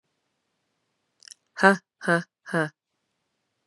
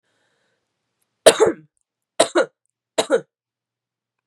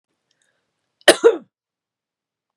{"exhalation_length": "3.7 s", "exhalation_amplitude": 29185, "exhalation_signal_mean_std_ratio": 0.23, "three_cough_length": "4.3 s", "three_cough_amplitude": 32768, "three_cough_signal_mean_std_ratio": 0.25, "cough_length": "2.6 s", "cough_amplitude": 32768, "cough_signal_mean_std_ratio": 0.2, "survey_phase": "beta (2021-08-13 to 2022-03-07)", "age": "18-44", "gender": "Female", "wearing_mask": "No", "symptom_cough_any": true, "symptom_runny_or_blocked_nose": true, "symptom_fever_high_temperature": true, "symptom_headache": true, "symptom_change_to_sense_of_smell_or_taste": true, "symptom_onset": "3 days", "smoker_status": "Ex-smoker", "respiratory_condition_asthma": true, "respiratory_condition_other": false, "recruitment_source": "Test and Trace", "submission_delay": "2 days", "covid_test_result": "Positive", "covid_test_method": "RT-qPCR", "covid_ct_value": 22.3, "covid_ct_gene": "S gene", "covid_ct_mean": 23.0, "covid_viral_load": "29000 copies/ml", "covid_viral_load_category": "Low viral load (10K-1M copies/ml)"}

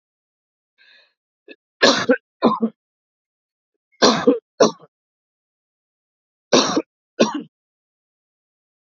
{"cough_length": "8.9 s", "cough_amplitude": 30599, "cough_signal_mean_std_ratio": 0.29, "survey_phase": "alpha (2021-03-01 to 2021-08-12)", "age": "65+", "gender": "Male", "wearing_mask": "No", "symptom_none": true, "smoker_status": "Ex-smoker", "respiratory_condition_asthma": false, "respiratory_condition_other": false, "recruitment_source": "REACT", "submission_delay": "2 days", "covid_test_result": "Negative", "covid_test_method": "RT-qPCR"}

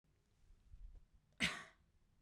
{"cough_length": "2.2 s", "cough_amplitude": 2211, "cough_signal_mean_std_ratio": 0.31, "survey_phase": "beta (2021-08-13 to 2022-03-07)", "age": "18-44", "gender": "Female", "wearing_mask": "No", "symptom_cough_any": true, "symptom_runny_or_blocked_nose": true, "symptom_sore_throat": true, "symptom_fatigue": true, "symptom_fever_high_temperature": true, "symptom_headache": true, "symptom_other": true, "symptom_onset": "3 days", "smoker_status": "Never smoked", "respiratory_condition_asthma": true, "respiratory_condition_other": false, "recruitment_source": "Test and Trace", "submission_delay": "1 day", "covid_test_result": "Positive", "covid_test_method": "RT-qPCR", "covid_ct_value": 17.8, "covid_ct_gene": "N gene", "covid_ct_mean": 18.6, "covid_viral_load": "810000 copies/ml", "covid_viral_load_category": "Low viral load (10K-1M copies/ml)"}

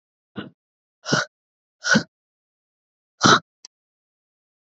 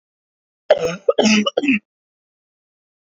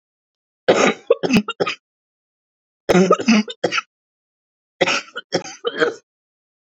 {"exhalation_length": "4.6 s", "exhalation_amplitude": 27788, "exhalation_signal_mean_std_ratio": 0.25, "cough_length": "3.1 s", "cough_amplitude": 26966, "cough_signal_mean_std_ratio": 0.39, "three_cough_length": "6.7 s", "three_cough_amplitude": 29940, "three_cough_signal_mean_std_ratio": 0.4, "survey_phase": "beta (2021-08-13 to 2022-03-07)", "age": "18-44", "gender": "Female", "wearing_mask": "No", "symptom_none": true, "symptom_onset": "8 days", "smoker_status": "Never smoked", "respiratory_condition_asthma": false, "respiratory_condition_other": false, "recruitment_source": "Test and Trace", "submission_delay": "3 days", "covid_test_result": "Negative", "covid_test_method": "RT-qPCR"}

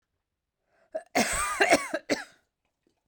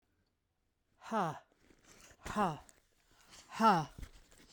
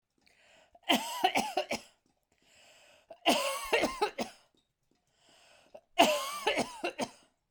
{"cough_length": "3.1 s", "cough_amplitude": 16994, "cough_signal_mean_std_ratio": 0.39, "exhalation_length": "4.5 s", "exhalation_amplitude": 5022, "exhalation_signal_mean_std_ratio": 0.34, "three_cough_length": "7.5 s", "three_cough_amplitude": 12588, "three_cough_signal_mean_std_ratio": 0.42, "survey_phase": "beta (2021-08-13 to 2022-03-07)", "age": "45-64", "gender": "Female", "wearing_mask": "No", "symptom_none": true, "smoker_status": "Ex-smoker", "respiratory_condition_asthma": false, "respiratory_condition_other": false, "recruitment_source": "Test and Trace", "submission_delay": "3 days", "covid_test_result": "Positive", "covid_test_method": "RT-qPCR", "covid_ct_value": 32.3, "covid_ct_gene": "N gene"}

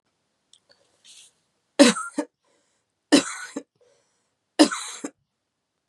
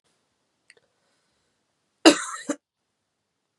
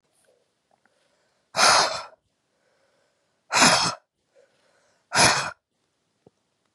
{"three_cough_length": "5.9 s", "three_cough_amplitude": 30235, "three_cough_signal_mean_std_ratio": 0.23, "cough_length": "3.6 s", "cough_amplitude": 32565, "cough_signal_mean_std_ratio": 0.16, "exhalation_length": "6.7 s", "exhalation_amplitude": 22886, "exhalation_signal_mean_std_ratio": 0.32, "survey_phase": "beta (2021-08-13 to 2022-03-07)", "age": "45-64", "gender": "Female", "wearing_mask": "No", "symptom_runny_or_blocked_nose": true, "symptom_onset": "3 days", "smoker_status": "Ex-smoker", "respiratory_condition_asthma": false, "respiratory_condition_other": false, "recruitment_source": "Test and Trace", "submission_delay": "2 days", "covid_test_result": "Positive", "covid_test_method": "RT-qPCR", "covid_ct_value": 23.6, "covid_ct_gene": "ORF1ab gene", "covid_ct_mean": 24.1, "covid_viral_load": "13000 copies/ml", "covid_viral_load_category": "Low viral load (10K-1M copies/ml)"}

